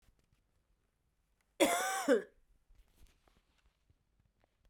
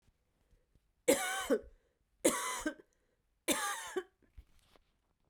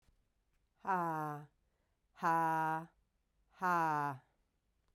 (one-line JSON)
{"cough_length": "4.7 s", "cough_amplitude": 6247, "cough_signal_mean_std_ratio": 0.28, "three_cough_length": "5.3 s", "three_cough_amplitude": 6389, "three_cough_signal_mean_std_ratio": 0.37, "exhalation_length": "4.9 s", "exhalation_amplitude": 2814, "exhalation_signal_mean_std_ratio": 0.5, "survey_phase": "beta (2021-08-13 to 2022-03-07)", "age": "45-64", "gender": "Female", "wearing_mask": "No", "symptom_cough_any": true, "symptom_new_continuous_cough": true, "symptom_runny_or_blocked_nose": true, "symptom_fatigue": true, "symptom_headache": true, "symptom_change_to_sense_of_smell_or_taste": true, "symptom_loss_of_taste": true, "symptom_onset": "3 days", "smoker_status": "Ex-smoker", "respiratory_condition_asthma": false, "respiratory_condition_other": false, "recruitment_source": "Test and Trace", "submission_delay": "2 days", "covid_test_result": "Positive", "covid_test_method": "RT-qPCR"}